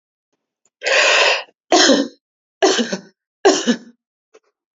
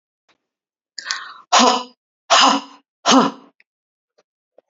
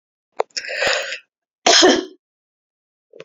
{"three_cough_length": "4.8 s", "three_cough_amplitude": 30138, "three_cough_signal_mean_std_ratio": 0.46, "exhalation_length": "4.7 s", "exhalation_amplitude": 32767, "exhalation_signal_mean_std_ratio": 0.36, "cough_length": "3.2 s", "cough_amplitude": 32404, "cough_signal_mean_std_ratio": 0.38, "survey_phase": "beta (2021-08-13 to 2022-03-07)", "age": "45-64", "gender": "Female", "wearing_mask": "No", "symptom_none": true, "smoker_status": "Never smoked", "respiratory_condition_asthma": false, "respiratory_condition_other": false, "recruitment_source": "REACT", "submission_delay": "1 day", "covid_test_result": "Negative", "covid_test_method": "RT-qPCR", "influenza_a_test_result": "Negative", "influenza_b_test_result": "Negative"}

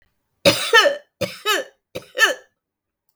{"three_cough_length": "3.2 s", "three_cough_amplitude": 32766, "three_cough_signal_mean_std_ratio": 0.4, "survey_phase": "beta (2021-08-13 to 2022-03-07)", "age": "45-64", "gender": "Female", "wearing_mask": "No", "symptom_none": true, "smoker_status": "Never smoked", "respiratory_condition_asthma": true, "respiratory_condition_other": false, "recruitment_source": "REACT", "submission_delay": "1 day", "covid_test_result": "Negative", "covid_test_method": "RT-qPCR"}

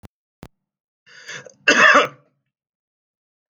{"cough_length": "3.5 s", "cough_amplitude": 29700, "cough_signal_mean_std_ratio": 0.28, "survey_phase": "alpha (2021-03-01 to 2021-08-12)", "age": "45-64", "gender": "Male", "wearing_mask": "No", "symptom_none": true, "symptom_onset": "6 days", "smoker_status": "Ex-smoker", "respiratory_condition_asthma": false, "respiratory_condition_other": false, "recruitment_source": "REACT", "submission_delay": "1 day", "covid_test_result": "Negative", "covid_test_method": "RT-qPCR"}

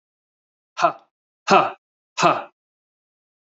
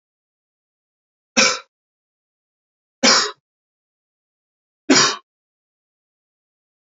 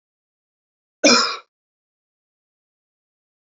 {"exhalation_length": "3.4 s", "exhalation_amplitude": 28422, "exhalation_signal_mean_std_ratio": 0.3, "three_cough_length": "7.0 s", "three_cough_amplitude": 30109, "three_cough_signal_mean_std_ratio": 0.24, "cough_length": "3.4 s", "cough_amplitude": 27982, "cough_signal_mean_std_ratio": 0.22, "survey_phase": "beta (2021-08-13 to 2022-03-07)", "age": "18-44", "gender": "Male", "wearing_mask": "No", "symptom_runny_or_blocked_nose": true, "symptom_fatigue": true, "symptom_fever_high_temperature": true, "symptom_onset": "3 days", "smoker_status": "Ex-smoker", "respiratory_condition_asthma": false, "respiratory_condition_other": false, "recruitment_source": "Test and Trace", "submission_delay": "1 day", "covid_test_result": "Positive", "covid_test_method": "RT-qPCR", "covid_ct_value": 23.8, "covid_ct_gene": "ORF1ab gene", "covid_ct_mean": 24.5, "covid_viral_load": "9000 copies/ml", "covid_viral_load_category": "Minimal viral load (< 10K copies/ml)"}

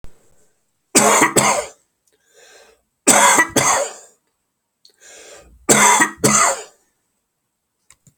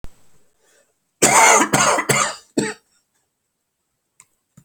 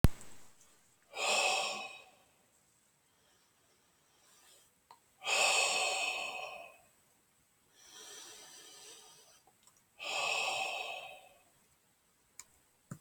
{"three_cough_length": "8.2 s", "three_cough_amplitude": 32768, "three_cough_signal_mean_std_ratio": 0.43, "cough_length": "4.6 s", "cough_amplitude": 31388, "cough_signal_mean_std_ratio": 0.4, "exhalation_length": "13.0 s", "exhalation_amplitude": 11931, "exhalation_signal_mean_std_ratio": 0.41, "survey_phase": "alpha (2021-03-01 to 2021-08-12)", "age": "45-64", "gender": "Male", "wearing_mask": "No", "symptom_none": true, "smoker_status": "Never smoked", "respiratory_condition_asthma": true, "respiratory_condition_other": false, "recruitment_source": "REACT", "submission_delay": "1 day", "covid_test_result": "Negative", "covid_test_method": "RT-qPCR"}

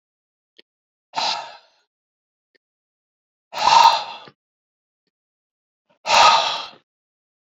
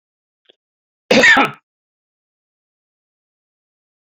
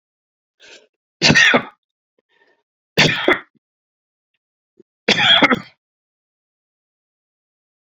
{"exhalation_length": "7.5 s", "exhalation_amplitude": 28176, "exhalation_signal_mean_std_ratio": 0.3, "cough_length": "4.2 s", "cough_amplitude": 29078, "cough_signal_mean_std_ratio": 0.24, "three_cough_length": "7.9 s", "three_cough_amplitude": 32768, "three_cough_signal_mean_std_ratio": 0.31, "survey_phase": "beta (2021-08-13 to 2022-03-07)", "age": "65+", "gender": "Male", "wearing_mask": "No", "symptom_none": true, "smoker_status": "Current smoker (e-cigarettes or vapes only)", "respiratory_condition_asthma": false, "respiratory_condition_other": false, "recruitment_source": "REACT", "submission_delay": "2 days", "covid_test_result": "Negative", "covid_test_method": "RT-qPCR"}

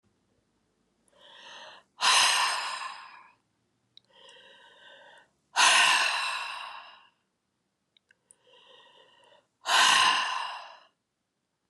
{"exhalation_length": "11.7 s", "exhalation_amplitude": 11700, "exhalation_signal_mean_std_ratio": 0.39, "survey_phase": "beta (2021-08-13 to 2022-03-07)", "age": "45-64", "gender": "Female", "wearing_mask": "No", "symptom_cough_any": true, "symptom_runny_or_blocked_nose": true, "symptom_diarrhoea": true, "symptom_onset": "4 days", "smoker_status": "Never smoked", "respiratory_condition_asthma": false, "respiratory_condition_other": false, "recruitment_source": "Test and Trace", "submission_delay": "2 days", "covid_test_result": "Positive", "covid_test_method": "RT-qPCR", "covid_ct_value": 22.2, "covid_ct_gene": "N gene"}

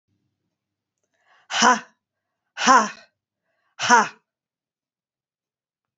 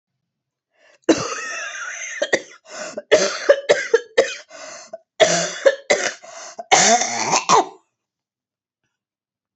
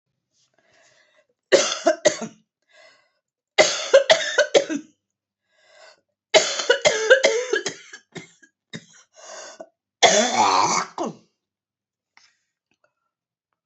{"exhalation_length": "6.0 s", "exhalation_amplitude": 28153, "exhalation_signal_mean_std_ratio": 0.26, "cough_length": "9.6 s", "cough_amplitude": 29302, "cough_signal_mean_std_ratio": 0.44, "three_cough_length": "13.7 s", "three_cough_amplitude": 28805, "three_cough_signal_mean_std_ratio": 0.37, "survey_phase": "alpha (2021-03-01 to 2021-08-12)", "age": "45-64", "gender": "Female", "wearing_mask": "No", "symptom_new_continuous_cough": true, "symptom_fatigue": true, "symptom_fever_high_temperature": true, "symptom_headache": true, "symptom_loss_of_taste": true, "symptom_onset": "3 days", "smoker_status": "Never smoked", "respiratory_condition_asthma": false, "respiratory_condition_other": false, "recruitment_source": "Test and Trace", "submission_delay": "2 days", "covid_test_result": "Positive", "covid_test_method": "RT-qPCR"}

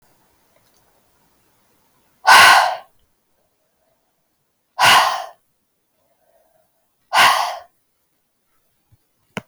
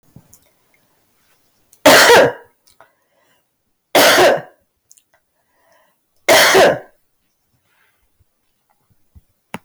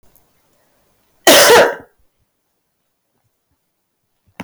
{"exhalation_length": "9.5 s", "exhalation_amplitude": 32768, "exhalation_signal_mean_std_ratio": 0.29, "three_cough_length": "9.6 s", "three_cough_amplitude": 32768, "three_cough_signal_mean_std_ratio": 0.35, "cough_length": "4.4 s", "cough_amplitude": 32768, "cough_signal_mean_std_ratio": 0.3, "survey_phase": "beta (2021-08-13 to 2022-03-07)", "age": "18-44", "gender": "Female", "wearing_mask": "No", "symptom_diarrhoea": true, "symptom_fatigue": true, "symptom_change_to_sense_of_smell_or_taste": true, "symptom_other": true, "symptom_onset": "3 days", "smoker_status": "Never smoked", "respiratory_condition_asthma": true, "respiratory_condition_other": false, "recruitment_source": "Test and Trace", "submission_delay": "2 days", "covid_test_result": "Positive", "covid_test_method": "RT-qPCR", "covid_ct_value": 21.2, "covid_ct_gene": "N gene"}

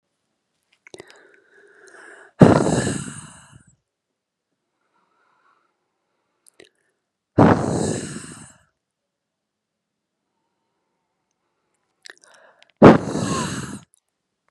{"exhalation_length": "14.5 s", "exhalation_amplitude": 32768, "exhalation_signal_mean_std_ratio": 0.24, "survey_phase": "beta (2021-08-13 to 2022-03-07)", "age": "45-64", "gender": "Female", "wearing_mask": "No", "symptom_runny_or_blocked_nose": true, "symptom_onset": "5 days", "smoker_status": "Never smoked", "respiratory_condition_asthma": true, "respiratory_condition_other": false, "recruitment_source": "REACT", "submission_delay": "2 days", "covid_test_result": "Negative", "covid_test_method": "RT-qPCR", "influenza_a_test_result": "Negative", "influenza_b_test_result": "Negative"}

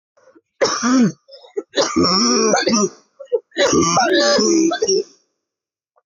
{"three_cough_length": "6.1 s", "three_cough_amplitude": 20448, "three_cough_signal_mean_std_ratio": 0.69, "survey_phase": "alpha (2021-03-01 to 2021-08-12)", "age": "18-44", "gender": "Female", "wearing_mask": "No", "symptom_cough_any": true, "symptom_shortness_of_breath": true, "symptom_fatigue": true, "symptom_headache": true, "symptom_onset": "9 days", "smoker_status": "Never smoked", "respiratory_condition_asthma": false, "respiratory_condition_other": false, "recruitment_source": "Test and Trace", "submission_delay": "2 days", "covid_test_result": "Positive", "covid_test_method": "RT-qPCR", "covid_ct_value": 19.8, "covid_ct_gene": "ORF1ab gene", "covid_ct_mean": 20.6, "covid_viral_load": "180000 copies/ml", "covid_viral_load_category": "Low viral load (10K-1M copies/ml)"}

